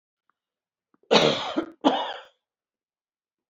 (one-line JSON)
{"cough_length": "3.5 s", "cough_amplitude": 23923, "cough_signal_mean_std_ratio": 0.33, "survey_phase": "beta (2021-08-13 to 2022-03-07)", "age": "65+", "gender": "Female", "wearing_mask": "No", "symptom_cough_any": true, "symptom_shortness_of_breath": true, "smoker_status": "Ex-smoker", "respiratory_condition_asthma": false, "respiratory_condition_other": false, "recruitment_source": "REACT", "submission_delay": "2 days", "covid_test_result": "Negative", "covid_test_method": "RT-qPCR"}